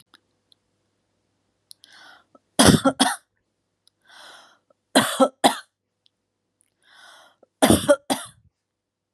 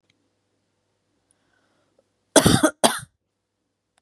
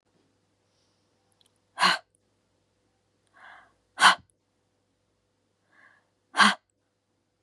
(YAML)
three_cough_length: 9.1 s
three_cough_amplitude: 32423
three_cough_signal_mean_std_ratio: 0.27
cough_length: 4.0 s
cough_amplitude: 32706
cough_signal_mean_std_ratio: 0.23
exhalation_length: 7.4 s
exhalation_amplitude: 21819
exhalation_signal_mean_std_ratio: 0.2
survey_phase: beta (2021-08-13 to 2022-03-07)
age: 18-44
gender: Female
wearing_mask: 'No'
symptom_sore_throat: true
smoker_status: Ex-smoker
respiratory_condition_asthma: false
respiratory_condition_other: false
recruitment_source: REACT
submission_delay: 1 day
covid_test_result: Negative
covid_test_method: RT-qPCR
influenza_a_test_result: Negative
influenza_b_test_result: Negative